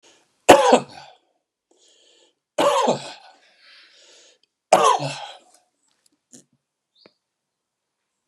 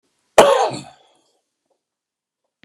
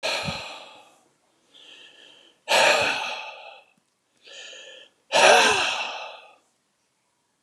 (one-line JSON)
{"three_cough_length": "8.3 s", "three_cough_amplitude": 32768, "three_cough_signal_mean_std_ratio": 0.27, "cough_length": "2.6 s", "cough_amplitude": 32768, "cough_signal_mean_std_ratio": 0.27, "exhalation_length": "7.4 s", "exhalation_amplitude": 26759, "exhalation_signal_mean_std_ratio": 0.4, "survey_phase": "beta (2021-08-13 to 2022-03-07)", "age": "65+", "gender": "Male", "wearing_mask": "No", "symptom_none": true, "smoker_status": "Ex-smoker", "respiratory_condition_asthma": false, "respiratory_condition_other": false, "recruitment_source": "REACT", "submission_delay": "2 days", "covid_test_result": "Negative", "covid_test_method": "RT-qPCR"}